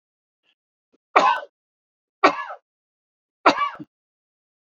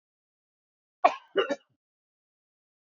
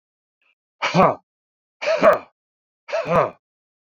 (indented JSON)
{
  "three_cough_length": "4.7 s",
  "three_cough_amplitude": 27269,
  "three_cough_signal_mean_std_ratio": 0.27,
  "cough_length": "2.8 s",
  "cough_amplitude": 16284,
  "cough_signal_mean_std_ratio": 0.2,
  "exhalation_length": "3.8 s",
  "exhalation_amplitude": 27074,
  "exhalation_signal_mean_std_ratio": 0.38,
  "survey_phase": "beta (2021-08-13 to 2022-03-07)",
  "age": "65+",
  "gender": "Male",
  "wearing_mask": "No",
  "symptom_cough_any": true,
  "smoker_status": "Never smoked",
  "respiratory_condition_asthma": false,
  "respiratory_condition_other": false,
  "recruitment_source": "REACT",
  "submission_delay": "1 day",
  "covid_test_result": "Negative",
  "covid_test_method": "RT-qPCR"
}